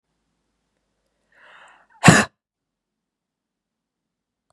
{"exhalation_length": "4.5 s", "exhalation_amplitude": 32768, "exhalation_signal_mean_std_ratio": 0.16, "survey_phase": "beta (2021-08-13 to 2022-03-07)", "age": "18-44", "gender": "Female", "wearing_mask": "No", "symptom_runny_or_blocked_nose": true, "symptom_fatigue": true, "symptom_headache": true, "smoker_status": "Never smoked", "respiratory_condition_asthma": false, "respiratory_condition_other": false, "recruitment_source": "Test and Trace", "submission_delay": "2 days", "covid_test_result": "Positive", "covid_test_method": "RT-qPCR", "covid_ct_value": 24.2, "covid_ct_gene": "N gene", "covid_ct_mean": 24.5, "covid_viral_load": "9400 copies/ml", "covid_viral_load_category": "Minimal viral load (< 10K copies/ml)"}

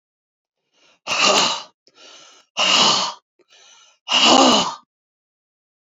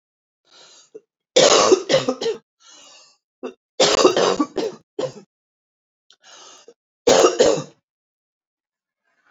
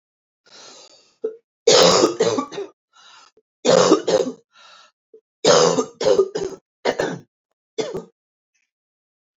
{"exhalation_length": "5.9 s", "exhalation_amplitude": 29713, "exhalation_signal_mean_std_ratio": 0.44, "cough_length": "9.3 s", "cough_amplitude": 29422, "cough_signal_mean_std_ratio": 0.38, "three_cough_length": "9.4 s", "three_cough_amplitude": 27488, "three_cough_signal_mean_std_ratio": 0.41, "survey_phase": "beta (2021-08-13 to 2022-03-07)", "age": "65+", "gender": "Female", "wearing_mask": "No", "symptom_none": true, "symptom_onset": "7 days", "smoker_status": "Never smoked", "respiratory_condition_asthma": false, "respiratory_condition_other": false, "recruitment_source": "Test and Trace", "submission_delay": "3 days", "covid_test_result": "Negative", "covid_test_method": "RT-qPCR"}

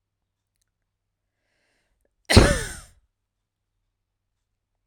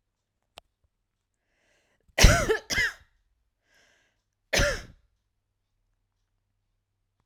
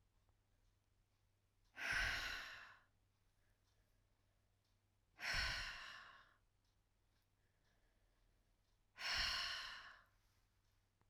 {"three_cough_length": "4.9 s", "three_cough_amplitude": 32768, "three_cough_signal_mean_std_ratio": 0.18, "cough_length": "7.3 s", "cough_amplitude": 25126, "cough_signal_mean_std_ratio": 0.23, "exhalation_length": "11.1 s", "exhalation_amplitude": 1153, "exhalation_signal_mean_std_ratio": 0.39, "survey_phase": "alpha (2021-03-01 to 2021-08-12)", "age": "18-44", "gender": "Female", "wearing_mask": "No", "symptom_none": true, "smoker_status": "Never smoked", "respiratory_condition_asthma": false, "respiratory_condition_other": false, "recruitment_source": "REACT", "submission_delay": "6 days", "covid_test_result": "Negative", "covid_test_method": "RT-qPCR"}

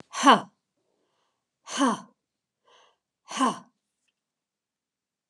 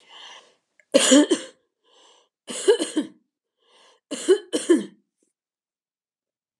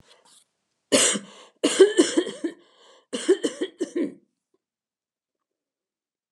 {"exhalation_length": "5.3 s", "exhalation_amplitude": 22006, "exhalation_signal_mean_std_ratio": 0.25, "three_cough_length": "6.6 s", "three_cough_amplitude": 30153, "three_cough_signal_mean_std_ratio": 0.32, "cough_length": "6.3 s", "cough_amplitude": 23433, "cough_signal_mean_std_ratio": 0.34, "survey_phase": "beta (2021-08-13 to 2022-03-07)", "age": "65+", "gender": "Female", "wearing_mask": "No", "symptom_none": true, "smoker_status": "Never smoked", "respiratory_condition_asthma": false, "respiratory_condition_other": false, "recruitment_source": "REACT", "submission_delay": "2 days", "covid_test_result": "Negative", "covid_test_method": "RT-qPCR"}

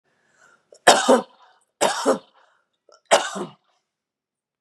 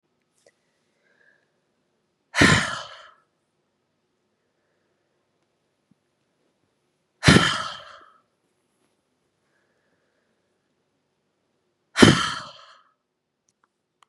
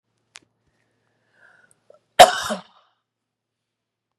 {"three_cough_length": "4.6 s", "three_cough_amplitude": 32767, "three_cough_signal_mean_std_ratio": 0.31, "exhalation_length": "14.1 s", "exhalation_amplitude": 32768, "exhalation_signal_mean_std_ratio": 0.2, "cough_length": "4.2 s", "cough_amplitude": 32768, "cough_signal_mean_std_ratio": 0.15, "survey_phase": "beta (2021-08-13 to 2022-03-07)", "age": "18-44", "gender": "Female", "wearing_mask": "No", "symptom_runny_or_blocked_nose": true, "symptom_fatigue": true, "symptom_headache": true, "smoker_status": "Never smoked", "respiratory_condition_asthma": false, "respiratory_condition_other": false, "recruitment_source": "Test and Trace", "submission_delay": "2 days", "covid_test_result": "Positive", "covid_test_method": "ePCR"}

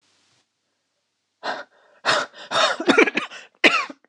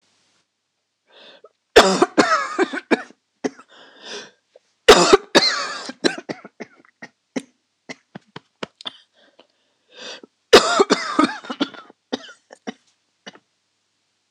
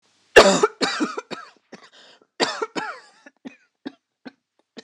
{"exhalation_length": "4.1 s", "exhalation_amplitude": 26028, "exhalation_signal_mean_std_ratio": 0.4, "three_cough_length": "14.3 s", "three_cough_amplitude": 26028, "three_cough_signal_mean_std_ratio": 0.3, "cough_length": "4.8 s", "cough_amplitude": 26028, "cough_signal_mean_std_ratio": 0.29, "survey_phase": "beta (2021-08-13 to 2022-03-07)", "age": "18-44", "gender": "Female", "wearing_mask": "No", "symptom_cough_any": true, "symptom_shortness_of_breath": true, "symptom_fatigue": true, "symptom_headache": true, "smoker_status": "Never smoked", "respiratory_condition_asthma": true, "respiratory_condition_other": false, "recruitment_source": "REACT", "submission_delay": "3 days", "covid_test_result": "Negative", "covid_test_method": "RT-qPCR", "influenza_a_test_result": "Negative", "influenza_b_test_result": "Negative"}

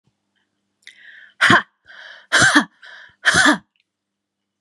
{"exhalation_length": "4.6 s", "exhalation_amplitude": 31483, "exhalation_signal_mean_std_ratio": 0.36, "survey_phase": "alpha (2021-03-01 to 2021-08-12)", "age": "45-64", "gender": "Female", "wearing_mask": "No", "symptom_none": true, "smoker_status": "Never smoked", "respiratory_condition_asthma": false, "respiratory_condition_other": false, "recruitment_source": "REACT", "submission_delay": "1 day", "covid_test_result": "Negative", "covid_test_method": "RT-qPCR"}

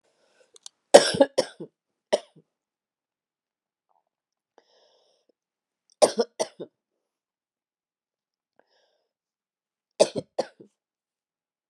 {"three_cough_length": "11.7 s", "three_cough_amplitude": 32768, "three_cough_signal_mean_std_ratio": 0.16, "survey_phase": "beta (2021-08-13 to 2022-03-07)", "age": "45-64", "gender": "Female", "wearing_mask": "No", "symptom_cough_any": true, "symptom_sore_throat": true, "symptom_fatigue": true, "symptom_headache": true, "symptom_change_to_sense_of_smell_or_taste": true, "smoker_status": "Never smoked", "respiratory_condition_asthma": false, "respiratory_condition_other": false, "recruitment_source": "Test and Trace", "submission_delay": "1 day", "covid_test_result": "Positive", "covid_test_method": "RT-qPCR", "covid_ct_value": 20.6, "covid_ct_gene": "N gene", "covid_ct_mean": 21.0, "covid_viral_load": "130000 copies/ml", "covid_viral_load_category": "Low viral load (10K-1M copies/ml)"}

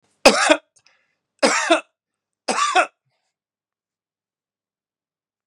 {"three_cough_length": "5.5 s", "three_cough_amplitude": 32768, "three_cough_signal_mean_std_ratio": 0.31, "survey_phase": "beta (2021-08-13 to 2022-03-07)", "age": "45-64", "gender": "Male", "wearing_mask": "No", "symptom_none": true, "symptom_onset": "13 days", "smoker_status": "Ex-smoker", "respiratory_condition_asthma": false, "respiratory_condition_other": false, "recruitment_source": "REACT", "submission_delay": "2 days", "covid_test_result": "Negative", "covid_test_method": "RT-qPCR"}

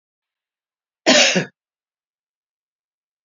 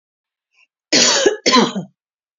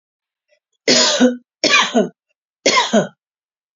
{"cough_length": "3.2 s", "cough_amplitude": 28517, "cough_signal_mean_std_ratio": 0.26, "exhalation_length": "2.4 s", "exhalation_amplitude": 32768, "exhalation_signal_mean_std_ratio": 0.46, "three_cough_length": "3.8 s", "three_cough_amplitude": 32128, "three_cough_signal_mean_std_ratio": 0.47, "survey_phase": "beta (2021-08-13 to 2022-03-07)", "age": "45-64", "gender": "Female", "wearing_mask": "No", "symptom_runny_or_blocked_nose": true, "symptom_shortness_of_breath": true, "symptom_sore_throat": true, "symptom_fatigue": true, "symptom_headache": true, "smoker_status": "Never smoked", "respiratory_condition_asthma": true, "respiratory_condition_other": false, "recruitment_source": "Test and Trace", "submission_delay": "2 days", "covid_test_result": "Positive", "covid_test_method": "LFT"}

